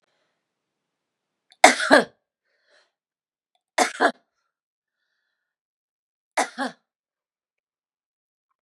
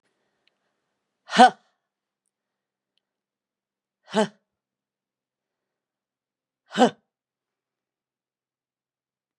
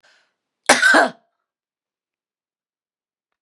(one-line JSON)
{"three_cough_length": "8.6 s", "three_cough_amplitude": 32768, "three_cough_signal_mean_std_ratio": 0.19, "exhalation_length": "9.4 s", "exhalation_amplitude": 32262, "exhalation_signal_mean_std_ratio": 0.14, "cough_length": "3.4 s", "cough_amplitude": 32768, "cough_signal_mean_std_ratio": 0.26, "survey_phase": "beta (2021-08-13 to 2022-03-07)", "age": "45-64", "gender": "Female", "wearing_mask": "No", "symptom_sore_throat": true, "smoker_status": "Never smoked", "respiratory_condition_asthma": true, "respiratory_condition_other": false, "recruitment_source": "Test and Trace", "submission_delay": "2 days", "covid_test_result": "Positive", "covid_test_method": "LFT"}